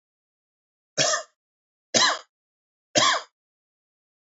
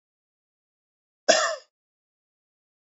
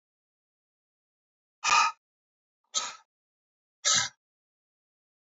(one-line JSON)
{"three_cough_length": "4.3 s", "three_cough_amplitude": 22122, "three_cough_signal_mean_std_ratio": 0.32, "cough_length": "2.8 s", "cough_amplitude": 25068, "cough_signal_mean_std_ratio": 0.22, "exhalation_length": "5.2 s", "exhalation_amplitude": 10924, "exhalation_signal_mean_std_ratio": 0.26, "survey_phase": "alpha (2021-03-01 to 2021-08-12)", "age": "45-64", "gender": "Male", "wearing_mask": "No", "symptom_none": true, "smoker_status": "Ex-smoker", "respiratory_condition_asthma": false, "respiratory_condition_other": false, "recruitment_source": "REACT", "submission_delay": "1 day", "covid_test_result": "Negative", "covid_test_method": "RT-qPCR"}